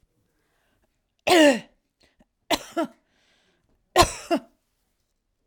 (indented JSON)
{
  "cough_length": "5.5 s",
  "cough_amplitude": 28247,
  "cough_signal_mean_std_ratio": 0.27,
  "survey_phase": "alpha (2021-03-01 to 2021-08-12)",
  "age": "65+",
  "gender": "Female",
  "wearing_mask": "No",
  "symptom_none": true,
  "smoker_status": "Current smoker (1 to 10 cigarettes per day)",
  "respiratory_condition_asthma": false,
  "respiratory_condition_other": false,
  "recruitment_source": "REACT",
  "submission_delay": "2 days",
  "covid_test_result": "Negative",
  "covid_test_method": "RT-qPCR"
}